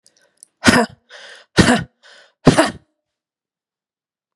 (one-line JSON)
{"exhalation_length": "4.4 s", "exhalation_amplitude": 32768, "exhalation_signal_mean_std_ratio": 0.3, "survey_phase": "beta (2021-08-13 to 2022-03-07)", "age": "45-64", "gender": "Female", "wearing_mask": "No", "symptom_runny_or_blocked_nose": true, "symptom_sore_throat": true, "symptom_fatigue": true, "symptom_headache": true, "smoker_status": "Ex-smoker", "respiratory_condition_asthma": true, "respiratory_condition_other": false, "recruitment_source": "Test and Trace", "submission_delay": "1 day", "covid_test_result": "Positive", "covid_test_method": "ePCR"}